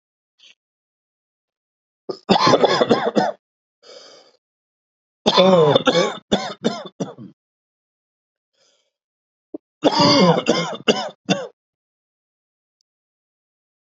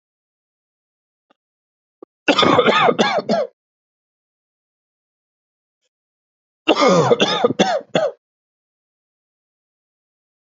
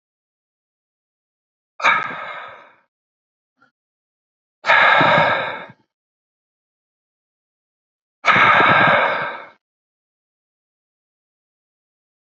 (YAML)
three_cough_length: 13.9 s
three_cough_amplitude: 32768
three_cough_signal_mean_std_ratio: 0.37
cough_length: 10.5 s
cough_amplitude: 32767
cough_signal_mean_std_ratio: 0.36
exhalation_length: 12.4 s
exhalation_amplitude: 32607
exhalation_signal_mean_std_ratio: 0.35
survey_phase: beta (2021-08-13 to 2022-03-07)
age: 45-64
gender: Male
wearing_mask: 'No'
symptom_none: true
smoker_status: Ex-smoker
respiratory_condition_asthma: false
respiratory_condition_other: false
recruitment_source: REACT
submission_delay: 1 day
covid_test_result: Negative
covid_test_method: RT-qPCR
influenza_a_test_result: Negative
influenza_b_test_result: Negative